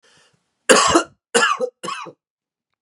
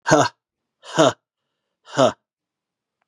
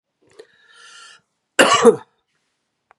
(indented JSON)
{
  "three_cough_length": "2.8 s",
  "three_cough_amplitude": 32768,
  "three_cough_signal_mean_std_ratio": 0.4,
  "exhalation_length": "3.1 s",
  "exhalation_amplitude": 32767,
  "exhalation_signal_mean_std_ratio": 0.32,
  "cough_length": "3.0 s",
  "cough_amplitude": 32768,
  "cough_signal_mean_std_ratio": 0.27,
  "survey_phase": "beta (2021-08-13 to 2022-03-07)",
  "age": "45-64",
  "gender": "Male",
  "wearing_mask": "No",
  "symptom_cough_any": true,
  "symptom_runny_or_blocked_nose": true,
  "symptom_sore_throat": true,
  "symptom_headache": true,
  "symptom_onset": "5 days",
  "smoker_status": "Ex-smoker",
  "respiratory_condition_asthma": false,
  "respiratory_condition_other": false,
  "recruitment_source": "Test and Trace",
  "submission_delay": "1 day",
  "covid_test_result": "Positive",
  "covid_test_method": "RT-qPCR",
  "covid_ct_value": 16.7,
  "covid_ct_gene": "ORF1ab gene",
  "covid_ct_mean": 16.9,
  "covid_viral_load": "3000000 copies/ml",
  "covid_viral_load_category": "High viral load (>1M copies/ml)"
}